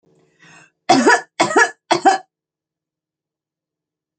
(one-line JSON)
{"three_cough_length": "4.2 s", "three_cough_amplitude": 32141, "three_cough_signal_mean_std_ratio": 0.34, "survey_phase": "alpha (2021-03-01 to 2021-08-12)", "age": "65+", "gender": "Female", "wearing_mask": "No", "symptom_none": true, "smoker_status": "Never smoked", "respiratory_condition_asthma": false, "respiratory_condition_other": false, "recruitment_source": "REACT", "submission_delay": "1 day", "covid_test_result": "Negative", "covid_test_method": "RT-qPCR"}